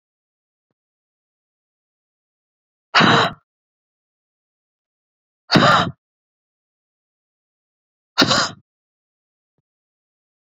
{
  "exhalation_length": "10.4 s",
  "exhalation_amplitude": 32767,
  "exhalation_signal_mean_std_ratio": 0.24,
  "survey_phase": "beta (2021-08-13 to 2022-03-07)",
  "age": "45-64",
  "gender": "Female",
  "wearing_mask": "No",
  "symptom_none": true,
  "smoker_status": "Never smoked",
  "respiratory_condition_asthma": true,
  "respiratory_condition_other": false,
  "recruitment_source": "REACT",
  "submission_delay": "1 day",
  "covid_test_result": "Negative",
  "covid_test_method": "RT-qPCR"
}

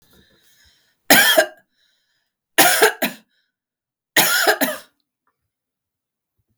{
  "three_cough_length": "6.6 s",
  "three_cough_amplitude": 32768,
  "three_cough_signal_mean_std_ratio": 0.35,
  "survey_phase": "beta (2021-08-13 to 2022-03-07)",
  "age": "65+",
  "gender": "Female",
  "wearing_mask": "No",
  "symptom_none": true,
  "smoker_status": "Never smoked",
  "respiratory_condition_asthma": false,
  "respiratory_condition_other": false,
  "recruitment_source": "REACT",
  "submission_delay": "8 days",
  "covid_test_result": "Negative",
  "covid_test_method": "RT-qPCR",
  "influenza_a_test_result": "Negative",
  "influenza_b_test_result": "Negative"
}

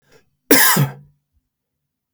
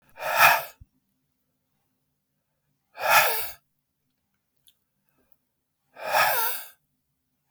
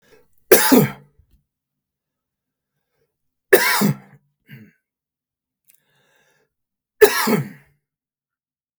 {
  "cough_length": "2.1 s",
  "cough_amplitude": 32768,
  "cough_signal_mean_std_ratio": 0.35,
  "exhalation_length": "7.5 s",
  "exhalation_amplitude": 25020,
  "exhalation_signal_mean_std_ratio": 0.33,
  "three_cough_length": "8.8 s",
  "three_cough_amplitude": 32768,
  "three_cough_signal_mean_std_ratio": 0.27,
  "survey_phase": "beta (2021-08-13 to 2022-03-07)",
  "age": "45-64",
  "gender": "Male",
  "wearing_mask": "No",
  "symptom_fatigue": true,
  "smoker_status": "Ex-smoker",
  "respiratory_condition_asthma": false,
  "respiratory_condition_other": false,
  "recruitment_source": "REACT",
  "submission_delay": "3 days",
  "covid_test_result": "Negative",
  "covid_test_method": "RT-qPCR",
  "influenza_a_test_result": "Negative",
  "influenza_b_test_result": "Negative"
}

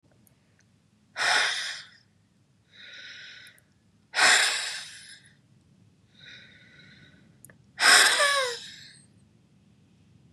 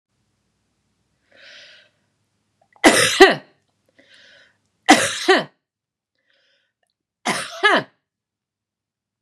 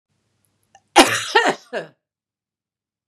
{
  "exhalation_length": "10.3 s",
  "exhalation_amplitude": 23176,
  "exhalation_signal_mean_std_ratio": 0.35,
  "three_cough_length": "9.2 s",
  "three_cough_amplitude": 32768,
  "three_cough_signal_mean_std_ratio": 0.27,
  "cough_length": "3.1 s",
  "cough_amplitude": 32768,
  "cough_signal_mean_std_ratio": 0.29,
  "survey_phase": "beta (2021-08-13 to 2022-03-07)",
  "age": "65+",
  "gender": "Female",
  "wearing_mask": "No",
  "symptom_none": true,
  "smoker_status": "Ex-smoker",
  "respiratory_condition_asthma": false,
  "respiratory_condition_other": false,
  "recruitment_source": "REACT",
  "submission_delay": "1 day",
  "covid_test_result": "Negative",
  "covid_test_method": "RT-qPCR",
  "influenza_a_test_result": "Negative",
  "influenza_b_test_result": "Negative"
}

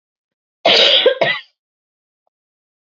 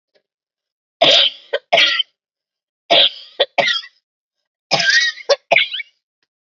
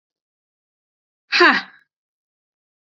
{
  "cough_length": "2.8 s",
  "cough_amplitude": 31006,
  "cough_signal_mean_std_ratio": 0.4,
  "three_cough_length": "6.5 s",
  "three_cough_amplitude": 32105,
  "three_cough_signal_mean_std_ratio": 0.43,
  "exhalation_length": "2.8 s",
  "exhalation_amplitude": 29131,
  "exhalation_signal_mean_std_ratio": 0.24,
  "survey_phase": "beta (2021-08-13 to 2022-03-07)",
  "age": "18-44",
  "gender": "Female",
  "wearing_mask": "No",
  "symptom_cough_any": true,
  "symptom_runny_or_blocked_nose": true,
  "symptom_sore_throat": true,
  "symptom_abdominal_pain": true,
  "symptom_fatigue": true,
  "symptom_headache": true,
  "symptom_onset": "4 days",
  "smoker_status": "Never smoked",
  "respiratory_condition_asthma": false,
  "respiratory_condition_other": false,
  "recruitment_source": "Test and Trace",
  "submission_delay": "2 days",
  "covid_test_result": "Positive",
  "covid_test_method": "RT-qPCR",
  "covid_ct_value": 24.7,
  "covid_ct_gene": "ORF1ab gene",
  "covid_ct_mean": 25.3,
  "covid_viral_load": "5000 copies/ml",
  "covid_viral_load_category": "Minimal viral load (< 10K copies/ml)"
}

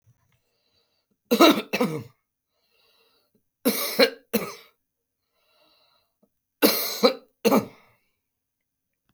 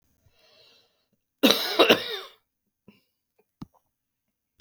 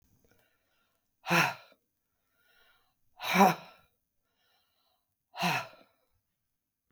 {
  "three_cough_length": "9.1 s",
  "three_cough_amplitude": 28242,
  "three_cough_signal_mean_std_ratio": 0.3,
  "cough_length": "4.6 s",
  "cough_amplitude": 30851,
  "cough_signal_mean_std_ratio": 0.25,
  "exhalation_length": "6.9 s",
  "exhalation_amplitude": 14125,
  "exhalation_signal_mean_std_ratio": 0.25,
  "survey_phase": "beta (2021-08-13 to 2022-03-07)",
  "age": "65+",
  "gender": "Female",
  "wearing_mask": "No",
  "symptom_sore_throat": true,
  "symptom_fatigue": true,
  "symptom_onset": "3 days",
  "smoker_status": "Ex-smoker",
  "respiratory_condition_asthma": false,
  "respiratory_condition_other": false,
  "recruitment_source": "Test and Trace",
  "submission_delay": "2 days",
  "covid_test_result": "Positive",
  "covid_test_method": "RT-qPCR",
  "covid_ct_value": 19.3,
  "covid_ct_gene": "ORF1ab gene"
}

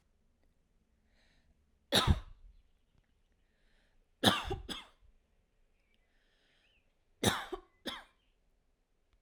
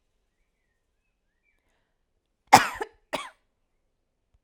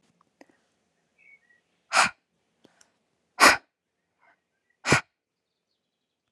{
  "three_cough_length": "9.2 s",
  "three_cough_amplitude": 9334,
  "three_cough_signal_mean_std_ratio": 0.24,
  "cough_length": "4.4 s",
  "cough_amplitude": 32768,
  "cough_signal_mean_std_ratio": 0.14,
  "exhalation_length": "6.3 s",
  "exhalation_amplitude": 25933,
  "exhalation_signal_mean_std_ratio": 0.2,
  "survey_phase": "alpha (2021-03-01 to 2021-08-12)",
  "age": "18-44",
  "gender": "Female",
  "wearing_mask": "No",
  "symptom_none": true,
  "symptom_onset": "2 days",
  "smoker_status": "Never smoked",
  "respiratory_condition_asthma": false,
  "respiratory_condition_other": false,
  "recruitment_source": "REACT",
  "submission_delay": "1 day",
  "covid_test_result": "Negative",
  "covid_test_method": "RT-qPCR"
}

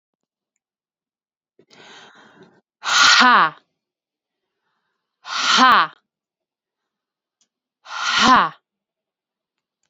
{
  "exhalation_length": "9.9 s",
  "exhalation_amplitude": 32767,
  "exhalation_signal_mean_std_ratio": 0.32,
  "survey_phase": "beta (2021-08-13 to 2022-03-07)",
  "age": "18-44",
  "gender": "Female",
  "wearing_mask": "No",
  "symptom_none": true,
  "smoker_status": "Ex-smoker",
  "respiratory_condition_asthma": false,
  "respiratory_condition_other": false,
  "recruitment_source": "REACT",
  "submission_delay": "2 days",
  "covid_test_result": "Negative",
  "covid_test_method": "RT-qPCR",
  "covid_ct_value": 38.5,
  "covid_ct_gene": "N gene",
  "influenza_a_test_result": "Negative",
  "influenza_b_test_result": "Negative"
}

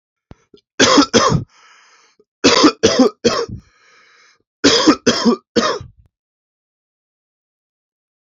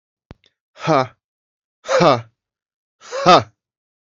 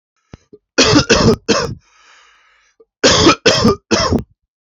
{
  "three_cough_length": "8.3 s",
  "three_cough_amplitude": 32767,
  "three_cough_signal_mean_std_ratio": 0.41,
  "exhalation_length": "4.2 s",
  "exhalation_amplitude": 30149,
  "exhalation_signal_mean_std_ratio": 0.32,
  "cough_length": "4.7 s",
  "cough_amplitude": 32768,
  "cough_signal_mean_std_ratio": 0.51,
  "survey_phase": "beta (2021-08-13 to 2022-03-07)",
  "age": "18-44",
  "gender": "Male",
  "wearing_mask": "No",
  "symptom_none": true,
  "symptom_onset": "12 days",
  "smoker_status": "Ex-smoker",
  "respiratory_condition_asthma": false,
  "respiratory_condition_other": false,
  "recruitment_source": "REACT",
  "submission_delay": "0 days",
  "covid_test_result": "Negative",
  "covid_test_method": "RT-qPCR",
  "influenza_a_test_result": "Negative",
  "influenza_b_test_result": "Negative"
}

